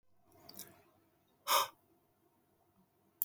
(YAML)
exhalation_length: 3.2 s
exhalation_amplitude: 7096
exhalation_signal_mean_std_ratio: 0.23
survey_phase: beta (2021-08-13 to 2022-03-07)
age: 18-44
gender: Male
wearing_mask: 'No'
symptom_none: true
symptom_onset: 7 days
smoker_status: Never smoked
respiratory_condition_asthma: false
respiratory_condition_other: false
recruitment_source: REACT
submission_delay: 3 days
covid_test_result: Positive
covid_test_method: RT-qPCR
covid_ct_value: 25.0
covid_ct_gene: N gene
influenza_a_test_result: Negative
influenza_b_test_result: Negative